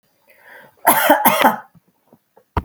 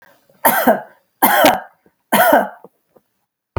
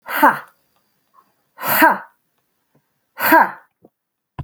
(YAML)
cough_length: 2.6 s
cough_amplitude: 32768
cough_signal_mean_std_ratio: 0.42
three_cough_length: 3.6 s
three_cough_amplitude: 32768
three_cough_signal_mean_std_ratio: 0.46
exhalation_length: 4.4 s
exhalation_amplitude: 32767
exhalation_signal_mean_std_ratio: 0.35
survey_phase: alpha (2021-03-01 to 2021-08-12)
age: 45-64
gender: Female
wearing_mask: 'No'
symptom_none: true
smoker_status: Never smoked
respiratory_condition_asthma: false
respiratory_condition_other: false
recruitment_source: REACT
submission_delay: 2 days
covid_test_result: Negative
covid_test_method: RT-qPCR